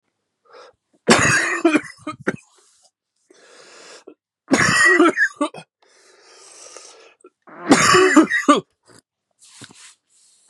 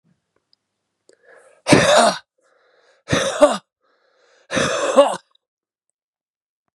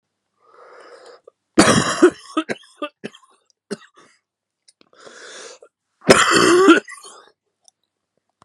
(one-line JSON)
{"three_cough_length": "10.5 s", "three_cough_amplitude": 32767, "three_cough_signal_mean_std_ratio": 0.4, "exhalation_length": "6.7 s", "exhalation_amplitude": 32768, "exhalation_signal_mean_std_ratio": 0.35, "cough_length": "8.4 s", "cough_amplitude": 32768, "cough_signal_mean_std_ratio": 0.33, "survey_phase": "beta (2021-08-13 to 2022-03-07)", "age": "18-44", "gender": "Male", "wearing_mask": "No", "symptom_cough_any": true, "symptom_new_continuous_cough": true, "symptom_runny_or_blocked_nose": true, "symptom_sore_throat": true, "symptom_headache": true, "symptom_other": true, "symptom_onset": "4 days", "smoker_status": "Ex-smoker", "respiratory_condition_asthma": false, "respiratory_condition_other": false, "recruitment_source": "Test and Trace", "submission_delay": "2 days", "covid_test_result": "Positive", "covid_test_method": "RT-qPCR", "covid_ct_value": 25.7, "covid_ct_gene": "N gene", "covid_ct_mean": 26.0, "covid_viral_load": "2900 copies/ml", "covid_viral_load_category": "Minimal viral load (< 10K copies/ml)"}